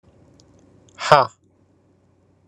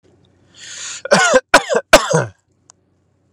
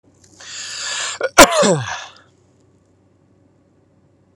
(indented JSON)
{
  "exhalation_length": "2.5 s",
  "exhalation_amplitude": 32768,
  "exhalation_signal_mean_std_ratio": 0.21,
  "three_cough_length": "3.3 s",
  "three_cough_amplitude": 32768,
  "three_cough_signal_mean_std_ratio": 0.38,
  "cough_length": "4.4 s",
  "cough_amplitude": 32768,
  "cough_signal_mean_std_ratio": 0.31,
  "survey_phase": "alpha (2021-03-01 to 2021-08-12)",
  "age": "18-44",
  "gender": "Male",
  "wearing_mask": "No",
  "symptom_none": true,
  "smoker_status": "Never smoked",
  "respiratory_condition_asthma": false,
  "respiratory_condition_other": false,
  "recruitment_source": "REACT",
  "submission_delay": "2 days",
  "covid_test_result": "Negative",
  "covid_test_method": "RT-qPCR"
}